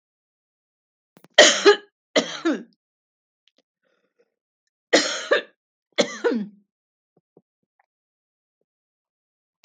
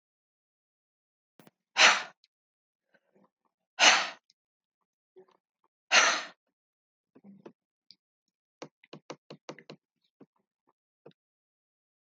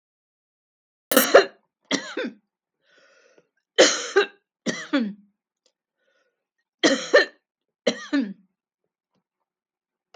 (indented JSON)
{
  "cough_length": "9.6 s",
  "cough_amplitude": 32768,
  "cough_signal_mean_std_ratio": 0.25,
  "exhalation_length": "12.1 s",
  "exhalation_amplitude": 17466,
  "exhalation_signal_mean_std_ratio": 0.2,
  "three_cough_length": "10.2 s",
  "three_cough_amplitude": 32768,
  "three_cough_signal_mean_std_ratio": 0.29,
  "survey_phase": "beta (2021-08-13 to 2022-03-07)",
  "age": "65+",
  "gender": "Female",
  "wearing_mask": "No",
  "symptom_none": true,
  "smoker_status": "Ex-smoker",
  "respiratory_condition_asthma": false,
  "respiratory_condition_other": false,
  "recruitment_source": "REACT",
  "submission_delay": "9 days",
  "covid_test_result": "Negative",
  "covid_test_method": "RT-qPCR",
  "influenza_a_test_result": "Negative",
  "influenza_b_test_result": "Negative"
}